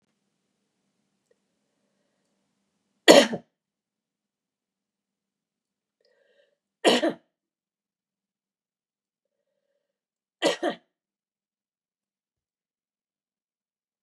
{"three_cough_length": "14.0 s", "three_cough_amplitude": 32768, "three_cough_signal_mean_std_ratio": 0.15, "survey_phase": "beta (2021-08-13 to 2022-03-07)", "age": "65+", "gender": "Female", "wearing_mask": "No", "symptom_cough_any": true, "smoker_status": "Ex-smoker", "respiratory_condition_asthma": false, "respiratory_condition_other": false, "recruitment_source": "REACT", "submission_delay": "1 day", "covid_test_result": "Negative", "covid_test_method": "RT-qPCR", "influenza_a_test_result": "Negative", "influenza_b_test_result": "Negative"}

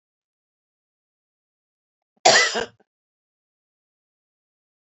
{"cough_length": "4.9 s", "cough_amplitude": 26948, "cough_signal_mean_std_ratio": 0.19, "survey_phase": "beta (2021-08-13 to 2022-03-07)", "age": "45-64", "gender": "Female", "wearing_mask": "No", "symptom_none": true, "smoker_status": "Never smoked", "respiratory_condition_asthma": false, "respiratory_condition_other": false, "recruitment_source": "REACT", "submission_delay": "2 days", "covid_test_result": "Negative", "covid_test_method": "RT-qPCR"}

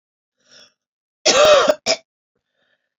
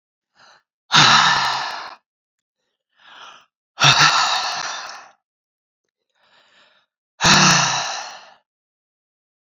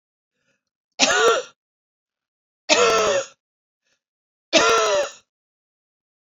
{"cough_length": "3.0 s", "cough_amplitude": 32768, "cough_signal_mean_std_ratio": 0.36, "exhalation_length": "9.6 s", "exhalation_amplitude": 31261, "exhalation_signal_mean_std_ratio": 0.4, "three_cough_length": "6.4 s", "three_cough_amplitude": 28716, "three_cough_signal_mean_std_ratio": 0.41, "survey_phase": "beta (2021-08-13 to 2022-03-07)", "age": "45-64", "gender": "Female", "wearing_mask": "No", "symptom_cough_any": true, "symptom_runny_or_blocked_nose": true, "symptom_sore_throat": true, "symptom_abdominal_pain": true, "symptom_fatigue": true, "symptom_fever_high_temperature": true, "symptom_headache": true, "symptom_other": true, "symptom_onset": "4 days", "smoker_status": "Ex-smoker", "respiratory_condition_asthma": false, "respiratory_condition_other": false, "recruitment_source": "Test and Trace", "submission_delay": "2 days", "covid_test_result": "Positive", "covid_test_method": "ePCR"}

